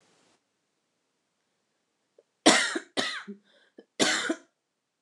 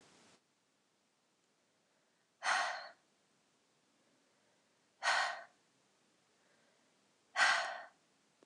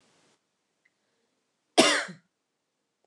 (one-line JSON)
{"three_cough_length": "5.0 s", "three_cough_amplitude": 23896, "three_cough_signal_mean_std_ratio": 0.29, "exhalation_length": "8.5 s", "exhalation_amplitude": 4232, "exhalation_signal_mean_std_ratio": 0.29, "cough_length": "3.1 s", "cough_amplitude": 25617, "cough_signal_mean_std_ratio": 0.22, "survey_phase": "beta (2021-08-13 to 2022-03-07)", "age": "18-44", "gender": "Female", "wearing_mask": "No", "symptom_shortness_of_breath": true, "symptom_onset": "6 days", "smoker_status": "Never smoked", "respiratory_condition_asthma": true, "respiratory_condition_other": false, "recruitment_source": "REACT", "submission_delay": "1 day", "covid_test_result": "Negative", "covid_test_method": "RT-qPCR"}